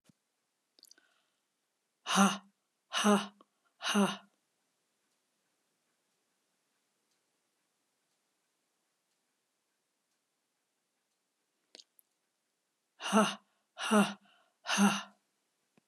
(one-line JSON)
{"exhalation_length": "15.9 s", "exhalation_amplitude": 7812, "exhalation_signal_mean_std_ratio": 0.26, "survey_phase": "alpha (2021-03-01 to 2021-08-12)", "age": "65+", "gender": "Female", "wearing_mask": "No", "symptom_none": true, "symptom_onset": "12 days", "smoker_status": "Ex-smoker", "respiratory_condition_asthma": false, "respiratory_condition_other": false, "recruitment_source": "REACT", "submission_delay": "1 day", "covid_test_result": "Negative", "covid_test_method": "RT-qPCR"}